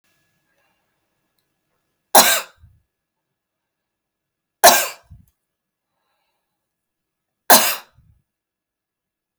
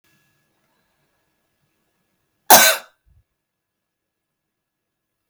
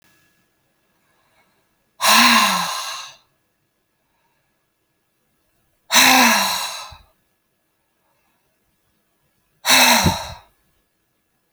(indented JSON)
{
  "three_cough_length": "9.4 s",
  "three_cough_amplitude": 32768,
  "three_cough_signal_mean_std_ratio": 0.2,
  "cough_length": "5.3 s",
  "cough_amplitude": 32768,
  "cough_signal_mean_std_ratio": 0.17,
  "exhalation_length": "11.5 s",
  "exhalation_amplitude": 32768,
  "exhalation_signal_mean_std_ratio": 0.34,
  "survey_phase": "beta (2021-08-13 to 2022-03-07)",
  "age": "45-64",
  "gender": "Female",
  "wearing_mask": "No",
  "symptom_none": true,
  "smoker_status": "Current smoker (11 or more cigarettes per day)",
  "respiratory_condition_asthma": false,
  "respiratory_condition_other": false,
  "recruitment_source": "REACT",
  "submission_delay": "8 days",
  "covid_test_result": "Negative",
  "covid_test_method": "RT-qPCR"
}